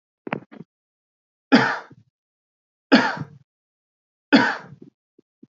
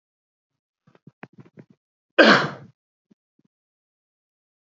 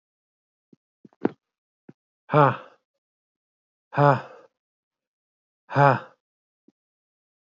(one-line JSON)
{"three_cough_length": "5.5 s", "three_cough_amplitude": 26983, "three_cough_signal_mean_std_ratio": 0.27, "cough_length": "4.8 s", "cough_amplitude": 28124, "cough_signal_mean_std_ratio": 0.19, "exhalation_length": "7.4 s", "exhalation_amplitude": 25028, "exhalation_signal_mean_std_ratio": 0.24, "survey_phase": "beta (2021-08-13 to 2022-03-07)", "age": "45-64", "gender": "Male", "wearing_mask": "No", "symptom_none": true, "smoker_status": "Never smoked", "respiratory_condition_asthma": false, "respiratory_condition_other": false, "recruitment_source": "REACT", "submission_delay": "1 day", "covid_test_result": "Negative", "covid_test_method": "RT-qPCR", "influenza_a_test_result": "Negative", "influenza_b_test_result": "Negative"}